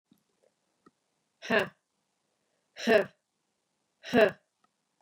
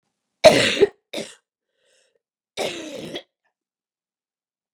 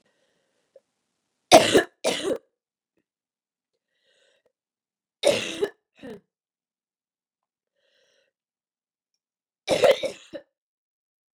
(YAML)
exhalation_length: 5.0 s
exhalation_amplitude: 9953
exhalation_signal_mean_std_ratio: 0.25
cough_length: 4.7 s
cough_amplitude: 32768
cough_signal_mean_std_ratio: 0.25
three_cough_length: 11.3 s
three_cough_amplitude: 32768
three_cough_signal_mean_std_ratio: 0.22
survey_phase: beta (2021-08-13 to 2022-03-07)
age: 18-44
gender: Female
wearing_mask: 'No'
symptom_cough_any: true
symptom_runny_or_blocked_nose: true
symptom_shortness_of_breath: true
symptom_abdominal_pain: true
symptom_fatigue: true
symptom_headache: true
symptom_other: true
smoker_status: Never smoked
respiratory_condition_asthma: false
respiratory_condition_other: false
recruitment_source: Test and Trace
submission_delay: 1 day
covid_test_result: Positive
covid_test_method: RT-qPCR
covid_ct_value: 21.5
covid_ct_gene: ORF1ab gene
covid_ct_mean: 22.0
covid_viral_load: 61000 copies/ml
covid_viral_load_category: Low viral load (10K-1M copies/ml)